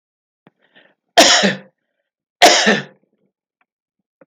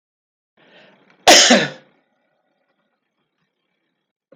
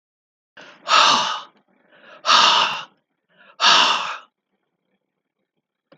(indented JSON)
{
  "three_cough_length": "4.3 s",
  "three_cough_amplitude": 32768,
  "three_cough_signal_mean_std_ratio": 0.33,
  "cough_length": "4.4 s",
  "cough_amplitude": 32768,
  "cough_signal_mean_std_ratio": 0.24,
  "exhalation_length": "6.0 s",
  "exhalation_amplitude": 32371,
  "exhalation_signal_mean_std_ratio": 0.41,
  "survey_phase": "beta (2021-08-13 to 2022-03-07)",
  "age": "65+",
  "gender": "Male",
  "wearing_mask": "No",
  "symptom_none": true,
  "smoker_status": "Ex-smoker",
  "respiratory_condition_asthma": false,
  "respiratory_condition_other": false,
  "recruitment_source": "REACT",
  "submission_delay": "5 days",
  "covid_test_result": "Negative",
  "covid_test_method": "RT-qPCR",
  "influenza_a_test_result": "Negative",
  "influenza_b_test_result": "Negative"
}